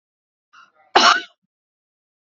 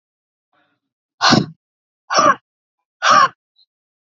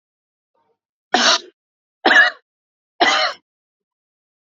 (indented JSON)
{
  "cough_length": "2.2 s",
  "cough_amplitude": 32658,
  "cough_signal_mean_std_ratio": 0.26,
  "exhalation_length": "4.0 s",
  "exhalation_amplitude": 28788,
  "exhalation_signal_mean_std_ratio": 0.34,
  "three_cough_length": "4.4 s",
  "three_cough_amplitude": 31158,
  "three_cough_signal_mean_std_ratio": 0.34,
  "survey_phase": "beta (2021-08-13 to 2022-03-07)",
  "age": "45-64",
  "gender": "Female",
  "wearing_mask": "No",
  "symptom_none": true,
  "smoker_status": "Ex-smoker",
  "respiratory_condition_asthma": false,
  "respiratory_condition_other": false,
  "recruitment_source": "REACT",
  "submission_delay": "3 days",
  "covid_test_result": "Negative",
  "covid_test_method": "RT-qPCR",
  "influenza_a_test_result": "Negative",
  "influenza_b_test_result": "Negative"
}